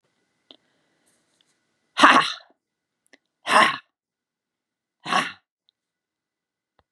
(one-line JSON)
{"exhalation_length": "6.9 s", "exhalation_amplitude": 32767, "exhalation_signal_mean_std_ratio": 0.24, "survey_phase": "beta (2021-08-13 to 2022-03-07)", "age": "45-64", "gender": "Female", "wearing_mask": "No", "symptom_cough_any": true, "symptom_runny_or_blocked_nose": true, "symptom_fatigue": true, "symptom_other": true, "symptom_onset": "2 days", "smoker_status": "Never smoked", "respiratory_condition_asthma": false, "respiratory_condition_other": false, "recruitment_source": "Test and Trace", "submission_delay": "1 day", "covid_test_result": "Positive", "covid_test_method": "RT-qPCR", "covid_ct_value": 17.0, "covid_ct_gene": "ORF1ab gene", "covid_ct_mean": 17.4, "covid_viral_load": "1900000 copies/ml", "covid_viral_load_category": "High viral load (>1M copies/ml)"}